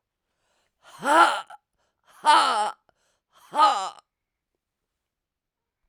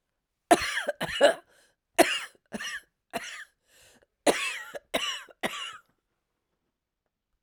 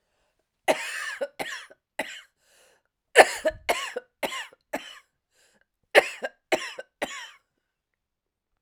{"exhalation_length": "5.9 s", "exhalation_amplitude": 19239, "exhalation_signal_mean_std_ratio": 0.33, "cough_length": "7.4 s", "cough_amplitude": 19349, "cough_signal_mean_std_ratio": 0.33, "three_cough_length": "8.6 s", "three_cough_amplitude": 32768, "three_cough_signal_mean_std_ratio": 0.27, "survey_phase": "alpha (2021-03-01 to 2021-08-12)", "age": "65+", "gender": "Female", "wearing_mask": "No", "symptom_cough_any": true, "symptom_shortness_of_breath": true, "symptom_fatigue": true, "symptom_fever_high_temperature": true, "symptom_onset": "3 days", "smoker_status": "Ex-smoker", "respiratory_condition_asthma": true, "respiratory_condition_other": true, "recruitment_source": "Test and Trace", "submission_delay": "2 days", "covid_test_result": "Positive", "covid_test_method": "RT-qPCR", "covid_ct_value": 21.6, "covid_ct_gene": "ORF1ab gene"}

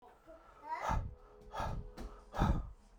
{"exhalation_length": "3.0 s", "exhalation_amplitude": 3866, "exhalation_signal_mean_std_ratio": 0.56, "survey_phase": "beta (2021-08-13 to 2022-03-07)", "age": "18-44", "gender": "Male", "wearing_mask": "No", "symptom_diarrhoea": true, "symptom_fatigue": true, "symptom_onset": "12 days", "smoker_status": "Never smoked", "respiratory_condition_asthma": false, "respiratory_condition_other": false, "recruitment_source": "REACT", "submission_delay": "2 days", "covid_test_result": "Negative", "covid_test_method": "RT-qPCR"}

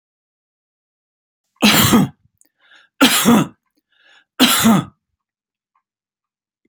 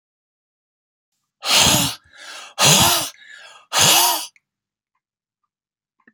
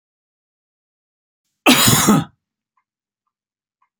{"three_cough_length": "6.7 s", "three_cough_amplitude": 32024, "three_cough_signal_mean_std_ratio": 0.36, "exhalation_length": "6.1 s", "exhalation_amplitude": 32490, "exhalation_signal_mean_std_ratio": 0.41, "cough_length": "4.0 s", "cough_amplitude": 32768, "cough_signal_mean_std_ratio": 0.3, "survey_phase": "alpha (2021-03-01 to 2021-08-12)", "age": "65+", "gender": "Male", "wearing_mask": "No", "symptom_none": true, "smoker_status": "Never smoked", "respiratory_condition_asthma": false, "respiratory_condition_other": false, "recruitment_source": "REACT", "submission_delay": "3 days", "covid_test_result": "Negative", "covid_test_method": "RT-qPCR"}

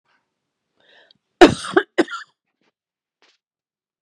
{"cough_length": "4.0 s", "cough_amplitude": 32768, "cough_signal_mean_std_ratio": 0.19, "survey_phase": "beta (2021-08-13 to 2022-03-07)", "age": "45-64", "gender": "Female", "wearing_mask": "No", "symptom_none": true, "smoker_status": "Ex-smoker", "respiratory_condition_asthma": false, "respiratory_condition_other": false, "recruitment_source": "REACT", "submission_delay": "1 day", "covid_test_result": "Negative", "covid_test_method": "RT-qPCR"}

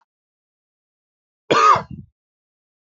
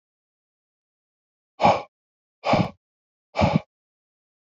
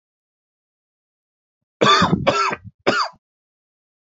{"cough_length": "2.9 s", "cough_amplitude": 26654, "cough_signal_mean_std_ratio": 0.27, "exhalation_length": "4.5 s", "exhalation_amplitude": 19644, "exhalation_signal_mean_std_ratio": 0.28, "three_cough_length": "4.1 s", "three_cough_amplitude": 27598, "three_cough_signal_mean_std_ratio": 0.37, "survey_phase": "beta (2021-08-13 to 2022-03-07)", "age": "45-64", "gender": "Male", "wearing_mask": "No", "symptom_none": true, "smoker_status": "Never smoked", "respiratory_condition_asthma": false, "respiratory_condition_other": false, "recruitment_source": "REACT", "submission_delay": "1 day", "covid_test_result": "Negative", "covid_test_method": "RT-qPCR"}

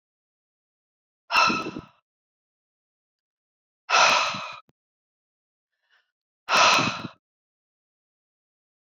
{"exhalation_length": "8.9 s", "exhalation_amplitude": 18639, "exhalation_signal_mean_std_ratio": 0.31, "survey_phase": "beta (2021-08-13 to 2022-03-07)", "age": "45-64", "gender": "Female", "wearing_mask": "No", "symptom_none": true, "smoker_status": "Current smoker (11 or more cigarettes per day)", "respiratory_condition_asthma": false, "respiratory_condition_other": false, "recruitment_source": "REACT", "submission_delay": "1 day", "covid_test_result": "Negative", "covid_test_method": "RT-qPCR"}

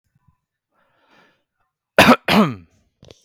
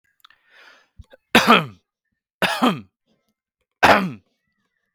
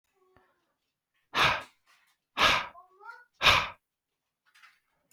{"cough_length": "3.2 s", "cough_amplitude": 32768, "cough_signal_mean_std_ratio": 0.28, "three_cough_length": "4.9 s", "three_cough_amplitude": 32768, "three_cough_signal_mean_std_ratio": 0.31, "exhalation_length": "5.1 s", "exhalation_amplitude": 15938, "exhalation_signal_mean_std_ratio": 0.31, "survey_phase": "beta (2021-08-13 to 2022-03-07)", "age": "18-44", "gender": "Male", "wearing_mask": "No", "symptom_fatigue": true, "symptom_headache": true, "smoker_status": "Ex-smoker", "respiratory_condition_asthma": false, "respiratory_condition_other": false, "recruitment_source": "REACT", "submission_delay": "2 days", "covid_test_result": "Negative", "covid_test_method": "RT-qPCR", "influenza_a_test_result": "Negative", "influenza_b_test_result": "Negative"}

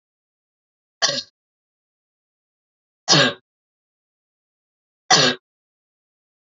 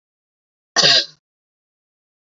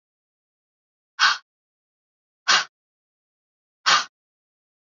{"three_cough_length": "6.6 s", "three_cough_amplitude": 28824, "three_cough_signal_mean_std_ratio": 0.24, "cough_length": "2.2 s", "cough_amplitude": 28862, "cough_signal_mean_std_ratio": 0.28, "exhalation_length": "4.9 s", "exhalation_amplitude": 21381, "exhalation_signal_mean_std_ratio": 0.24, "survey_phase": "beta (2021-08-13 to 2022-03-07)", "age": "45-64", "gender": "Female", "wearing_mask": "No", "symptom_runny_or_blocked_nose": true, "symptom_onset": "12 days", "smoker_status": "Never smoked", "respiratory_condition_asthma": false, "respiratory_condition_other": false, "recruitment_source": "REACT", "submission_delay": "3 days", "covid_test_result": "Negative", "covid_test_method": "RT-qPCR", "influenza_a_test_result": "Negative", "influenza_b_test_result": "Negative"}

